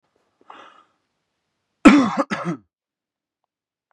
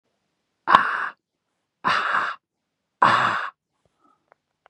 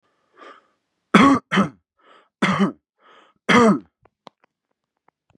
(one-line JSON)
{"cough_length": "3.9 s", "cough_amplitude": 32768, "cough_signal_mean_std_ratio": 0.25, "exhalation_length": "4.7 s", "exhalation_amplitude": 32768, "exhalation_signal_mean_std_ratio": 0.38, "three_cough_length": "5.4 s", "three_cough_amplitude": 31504, "three_cough_signal_mean_std_ratio": 0.34, "survey_phase": "beta (2021-08-13 to 2022-03-07)", "age": "18-44", "gender": "Male", "wearing_mask": "No", "symptom_diarrhoea": true, "symptom_fatigue": true, "symptom_headache": true, "symptom_change_to_sense_of_smell_or_taste": true, "symptom_onset": "9 days", "smoker_status": "Current smoker (e-cigarettes or vapes only)", "respiratory_condition_asthma": false, "respiratory_condition_other": false, "recruitment_source": "REACT", "submission_delay": "2 days", "covid_test_result": "Negative", "covid_test_method": "RT-qPCR", "influenza_a_test_result": "Unknown/Void", "influenza_b_test_result": "Unknown/Void"}